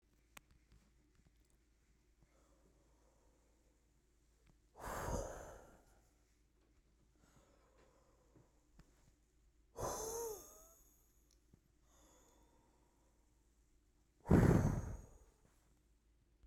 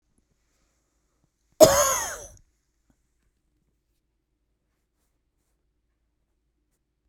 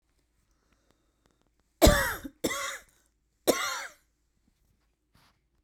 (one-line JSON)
{"exhalation_length": "16.5 s", "exhalation_amplitude": 4774, "exhalation_signal_mean_std_ratio": 0.24, "cough_length": "7.1 s", "cough_amplitude": 32768, "cough_signal_mean_std_ratio": 0.17, "three_cough_length": "5.6 s", "three_cough_amplitude": 20091, "three_cough_signal_mean_std_ratio": 0.27, "survey_phase": "beta (2021-08-13 to 2022-03-07)", "age": "45-64", "gender": "Female", "wearing_mask": "No", "symptom_fatigue": true, "smoker_status": "Never smoked", "respiratory_condition_asthma": false, "respiratory_condition_other": false, "recruitment_source": "REACT", "submission_delay": "1 day", "covid_test_result": "Negative", "covid_test_method": "RT-qPCR", "influenza_a_test_result": "Negative", "influenza_b_test_result": "Negative"}